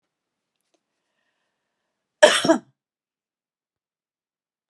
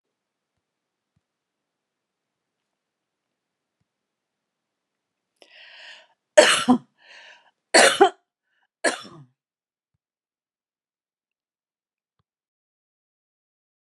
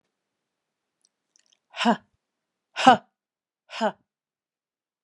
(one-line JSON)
{"cough_length": "4.7 s", "cough_amplitude": 32350, "cough_signal_mean_std_ratio": 0.18, "three_cough_length": "14.0 s", "three_cough_amplitude": 32428, "three_cough_signal_mean_std_ratio": 0.18, "exhalation_length": "5.0 s", "exhalation_amplitude": 30821, "exhalation_signal_mean_std_ratio": 0.2, "survey_phase": "beta (2021-08-13 to 2022-03-07)", "age": "65+", "gender": "Female", "wearing_mask": "No", "symptom_none": true, "smoker_status": "Ex-smoker", "respiratory_condition_asthma": false, "respiratory_condition_other": false, "recruitment_source": "REACT", "submission_delay": "2 days", "covid_test_result": "Negative", "covid_test_method": "RT-qPCR"}